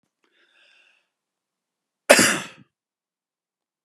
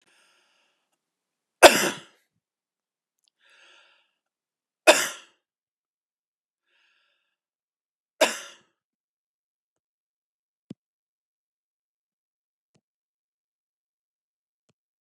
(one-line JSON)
{"cough_length": "3.8 s", "cough_amplitude": 32768, "cough_signal_mean_std_ratio": 0.2, "three_cough_length": "15.0 s", "three_cough_amplitude": 32768, "three_cough_signal_mean_std_ratio": 0.12, "survey_phase": "beta (2021-08-13 to 2022-03-07)", "age": "45-64", "gender": "Male", "wearing_mask": "No", "symptom_none": true, "smoker_status": "Never smoked", "respiratory_condition_asthma": false, "respiratory_condition_other": false, "recruitment_source": "REACT", "submission_delay": "6 days", "covid_test_result": "Negative", "covid_test_method": "RT-qPCR", "influenza_a_test_result": "Negative", "influenza_b_test_result": "Negative"}